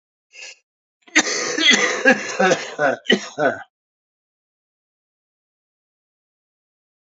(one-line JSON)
{"cough_length": "7.1 s", "cough_amplitude": 31397, "cough_signal_mean_std_ratio": 0.38, "survey_phase": "beta (2021-08-13 to 2022-03-07)", "age": "45-64", "gender": "Male", "wearing_mask": "No", "symptom_cough_any": true, "symptom_runny_or_blocked_nose": true, "symptom_shortness_of_breath": true, "symptom_fatigue": true, "symptom_change_to_sense_of_smell_or_taste": true, "symptom_loss_of_taste": true, "symptom_onset": "5 days", "smoker_status": "Current smoker (11 or more cigarettes per day)", "respiratory_condition_asthma": false, "respiratory_condition_other": false, "recruitment_source": "Test and Trace", "submission_delay": "1 day", "covid_test_result": "Positive", "covid_test_method": "RT-qPCR", "covid_ct_value": 22.6, "covid_ct_gene": "ORF1ab gene", "covid_ct_mean": 23.5, "covid_viral_load": "20000 copies/ml", "covid_viral_load_category": "Low viral load (10K-1M copies/ml)"}